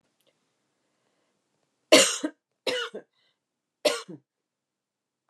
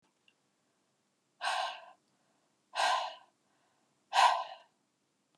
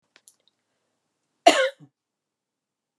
three_cough_length: 5.3 s
three_cough_amplitude: 23894
three_cough_signal_mean_std_ratio: 0.23
exhalation_length: 5.4 s
exhalation_amplitude: 7545
exhalation_signal_mean_std_ratio: 0.32
cough_length: 3.0 s
cough_amplitude: 29408
cough_signal_mean_std_ratio: 0.19
survey_phase: beta (2021-08-13 to 2022-03-07)
age: 45-64
gender: Female
wearing_mask: 'No'
symptom_none: true
smoker_status: Never smoked
respiratory_condition_asthma: false
respiratory_condition_other: false
recruitment_source: REACT
submission_delay: 1 day
covid_test_result: Negative
covid_test_method: RT-qPCR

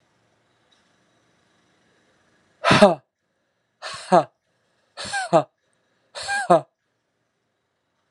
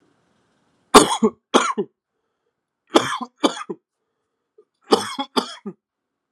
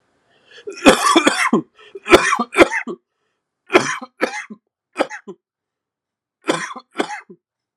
exhalation_length: 8.1 s
exhalation_amplitude: 32767
exhalation_signal_mean_std_ratio: 0.25
three_cough_length: 6.3 s
three_cough_amplitude: 32768
three_cough_signal_mean_std_ratio: 0.28
cough_length: 7.8 s
cough_amplitude: 32768
cough_signal_mean_std_ratio: 0.36
survey_phase: alpha (2021-03-01 to 2021-08-12)
age: 18-44
gender: Male
wearing_mask: 'No'
symptom_cough_any: true
symptom_fatigue: true
symptom_fever_high_temperature: true
symptom_headache: true
symptom_loss_of_taste: true
symptom_onset: 3 days
smoker_status: Never smoked
respiratory_condition_asthma: false
respiratory_condition_other: false
recruitment_source: Test and Trace
submission_delay: 2 days
covid_test_result: Positive
covid_test_method: RT-qPCR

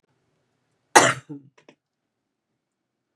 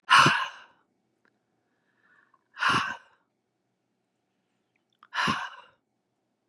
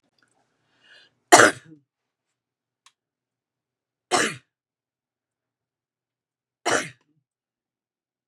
cough_length: 3.2 s
cough_amplitude: 32767
cough_signal_mean_std_ratio: 0.18
exhalation_length: 6.5 s
exhalation_amplitude: 20106
exhalation_signal_mean_std_ratio: 0.28
three_cough_length: 8.3 s
three_cough_amplitude: 32768
three_cough_signal_mean_std_ratio: 0.17
survey_phase: beta (2021-08-13 to 2022-03-07)
age: 65+
gender: Female
wearing_mask: 'No'
symptom_cough_any: true
smoker_status: Ex-smoker
respiratory_condition_asthma: false
respiratory_condition_other: false
recruitment_source: REACT
submission_delay: 1 day
covid_test_result: Negative
covid_test_method: RT-qPCR
influenza_a_test_result: Negative
influenza_b_test_result: Negative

